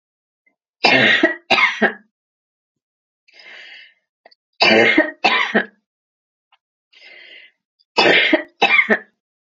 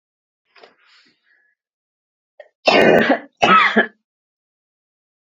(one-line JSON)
{"three_cough_length": "9.6 s", "three_cough_amplitude": 32767, "three_cough_signal_mean_std_ratio": 0.41, "cough_length": "5.3 s", "cough_amplitude": 32768, "cough_signal_mean_std_ratio": 0.34, "survey_phase": "beta (2021-08-13 to 2022-03-07)", "age": "45-64", "gender": "Female", "wearing_mask": "No", "symptom_sore_throat": true, "symptom_headache": true, "smoker_status": "Never smoked", "respiratory_condition_asthma": false, "respiratory_condition_other": false, "recruitment_source": "REACT", "submission_delay": "0 days", "covid_test_result": "Negative", "covid_test_method": "RT-qPCR"}